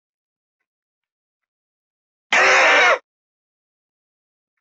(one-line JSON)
{"cough_length": "4.6 s", "cough_amplitude": 21785, "cough_signal_mean_std_ratio": 0.32, "survey_phase": "beta (2021-08-13 to 2022-03-07)", "age": "65+", "gender": "Male", "wearing_mask": "No", "symptom_none": true, "smoker_status": "Never smoked", "respiratory_condition_asthma": true, "respiratory_condition_other": true, "recruitment_source": "REACT", "submission_delay": "2 days", "covid_test_result": "Negative", "covid_test_method": "RT-qPCR", "influenza_a_test_result": "Negative", "influenza_b_test_result": "Negative"}